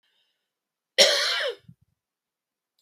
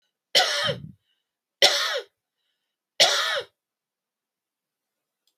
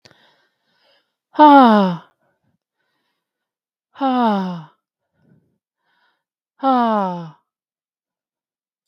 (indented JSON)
{
  "cough_length": "2.8 s",
  "cough_amplitude": 27609,
  "cough_signal_mean_std_ratio": 0.31,
  "three_cough_length": "5.4 s",
  "three_cough_amplitude": 30410,
  "three_cough_signal_mean_std_ratio": 0.35,
  "exhalation_length": "8.9 s",
  "exhalation_amplitude": 32768,
  "exhalation_signal_mean_std_ratio": 0.32,
  "survey_phase": "beta (2021-08-13 to 2022-03-07)",
  "age": "45-64",
  "gender": "Female",
  "wearing_mask": "No",
  "symptom_none": true,
  "smoker_status": "Never smoked",
  "respiratory_condition_asthma": false,
  "respiratory_condition_other": false,
  "recruitment_source": "REACT",
  "submission_delay": "2 days",
  "covid_test_result": "Negative",
  "covid_test_method": "RT-qPCR",
  "influenza_a_test_result": "Negative",
  "influenza_b_test_result": "Negative"
}